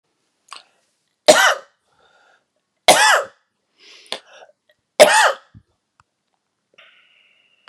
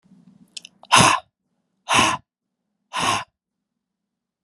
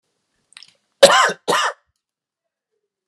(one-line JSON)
{"three_cough_length": "7.7 s", "three_cough_amplitude": 32768, "three_cough_signal_mean_std_ratio": 0.28, "exhalation_length": "4.4 s", "exhalation_amplitude": 31086, "exhalation_signal_mean_std_ratio": 0.33, "cough_length": "3.1 s", "cough_amplitude": 32768, "cough_signal_mean_std_ratio": 0.3, "survey_phase": "beta (2021-08-13 to 2022-03-07)", "age": "45-64", "gender": "Male", "wearing_mask": "No", "symptom_cough_any": true, "symptom_fatigue": true, "symptom_fever_high_temperature": true, "symptom_headache": true, "symptom_change_to_sense_of_smell_or_taste": true, "symptom_onset": "3 days", "smoker_status": "Never smoked", "respiratory_condition_asthma": false, "respiratory_condition_other": false, "recruitment_source": "Test and Trace", "submission_delay": "1 day", "covid_test_result": "Positive", "covid_test_method": "RT-qPCR", "covid_ct_value": 17.7, "covid_ct_gene": "ORF1ab gene", "covid_ct_mean": 18.3, "covid_viral_load": "1000000 copies/ml", "covid_viral_load_category": "High viral load (>1M copies/ml)"}